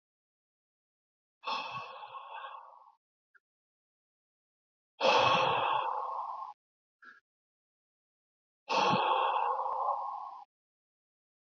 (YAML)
exhalation_length: 11.4 s
exhalation_amplitude: 6805
exhalation_signal_mean_std_ratio: 0.45
survey_phase: beta (2021-08-13 to 2022-03-07)
age: 18-44
gender: Male
wearing_mask: 'No'
symptom_none: true
smoker_status: Ex-smoker
respiratory_condition_asthma: false
respiratory_condition_other: false
recruitment_source: REACT
submission_delay: 2 days
covid_test_result: Negative
covid_test_method: RT-qPCR